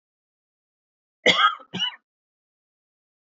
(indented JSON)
{
  "cough_length": "3.3 s",
  "cough_amplitude": 23045,
  "cough_signal_mean_std_ratio": 0.26,
  "survey_phase": "beta (2021-08-13 to 2022-03-07)",
  "age": "18-44",
  "gender": "Male",
  "wearing_mask": "No",
  "symptom_cough_any": true,
  "symptom_runny_or_blocked_nose": true,
  "symptom_fatigue": true,
  "symptom_headache": true,
  "smoker_status": "Never smoked",
  "respiratory_condition_asthma": false,
  "respiratory_condition_other": false,
  "recruitment_source": "Test and Trace",
  "submission_delay": "2 days",
  "covid_test_result": "Positive",
  "covid_test_method": "RT-qPCR",
  "covid_ct_value": 14.8,
  "covid_ct_gene": "ORF1ab gene"
}